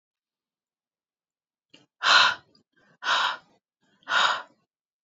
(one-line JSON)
{"exhalation_length": "5.0 s", "exhalation_amplitude": 21735, "exhalation_signal_mean_std_ratio": 0.33, "survey_phase": "alpha (2021-03-01 to 2021-08-12)", "age": "18-44", "gender": "Female", "wearing_mask": "No", "symptom_none": true, "smoker_status": "Never smoked", "respiratory_condition_asthma": false, "respiratory_condition_other": false, "recruitment_source": "REACT", "submission_delay": "2 days", "covid_test_result": "Negative", "covid_test_method": "RT-qPCR"}